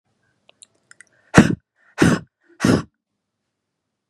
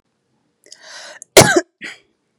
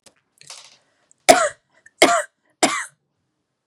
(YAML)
exhalation_length: 4.1 s
exhalation_amplitude: 32768
exhalation_signal_mean_std_ratio: 0.27
cough_length: 2.4 s
cough_amplitude: 32768
cough_signal_mean_std_ratio: 0.26
three_cough_length: 3.7 s
three_cough_amplitude: 32768
three_cough_signal_mean_std_ratio: 0.28
survey_phase: beta (2021-08-13 to 2022-03-07)
age: 18-44
gender: Female
wearing_mask: 'No'
symptom_none: true
smoker_status: Ex-smoker
respiratory_condition_asthma: false
respiratory_condition_other: false
recruitment_source: REACT
submission_delay: 2 days
covid_test_result: Negative
covid_test_method: RT-qPCR
influenza_a_test_result: Negative
influenza_b_test_result: Negative